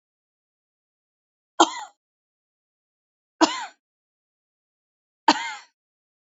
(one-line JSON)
{"three_cough_length": "6.3 s", "three_cough_amplitude": 27393, "three_cough_signal_mean_std_ratio": 0.18, "survey_phase": "beta (2021-08-13 to 2022-03-07)", "age": "45-64", "gender": "Female", "wearing_mask": "No", "symptom_none": true, "smoker_status": "Ex-smoker", "respiratory_condition_asthma": false, "respiratory_condition_other": false, "recruitment_source": "REACT", "submission_delay": "0 days", "covid_test_result": "Negative", "covid_test_method": "RT-qPCR"}